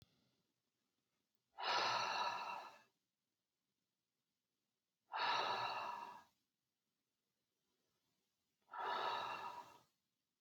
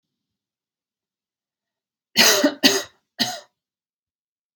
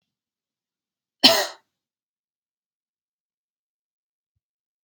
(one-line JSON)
{"exhalation_length": "10.4 s", "exhalation_amplitude": 1486, "exhalation_signal_mean_std_ratio": 0.44, "three_cough_length": "4.6 s", "three_cough_amplitude": 32768, "three_cough_signal_mean_std_ratio": 0.29, "cough_length": "4.8 s", "cough_amplitude": 31571, "cough_signal_mean_std_ratio": 0.15, "survey_phase": "beta (2021-08-13 to 2022-03-07)", "age": "18-44", "gender": "Female", "wearing_mask": "No", "symptom_none": true, "smoker_status": "Never smoked", "respiratory_condition_asthma": false, "respiratory_condition_other": false, "recruitment_source": "REACT", "submission_delay": "1 day", "covid_test_result": "Negative", "covid_test_method": "RT-qPCR"}